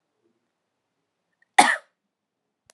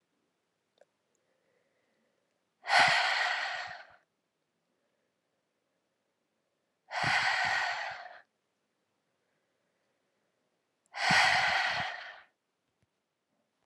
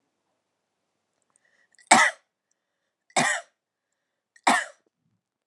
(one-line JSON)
{"cough_length": "2.7 s", "cough_amplitude": 32575, "cough_signal_mean_std_ratio": 0.17, "exhalation_length": "13.7 s", "exhalation_amplitude": 8213, "exhalation_signal_mean_std_ratio": 0.37, "three_cough_length": "5.5 s", "three_cough_amplitude": 27088, "three_cough_signal_mean_std_ratio": 0.24, "survey_phase": "beta (2021-08-13 to 2022-03-07)", "age": "18-44", "gender": "Female", "wearing_mask": "No", "symptom_cough_any": true, "symptom_new_continuous_cough": true, "symptom_runny_or_blocked_nose": true, "symptom_onset": "4 days", "smoker_status": "Never smoked", "respiratory_condition_asthma": false, "respiratory_condition_other": false, "recruitment_source": "Test and Trace", "submission_delay": "2 days", "covid_test_result": "Positive", "covid_test_method": "RT-qPCR", "covid_ct_value": 15.6, "covid_ct_gene": "ORF1ab gene", "covid_ct_mean": 15.8, "covid_viral_load": "6800000 copies/ml", "covid_viral_load_category": "High viral load (>1M copies/ml)"}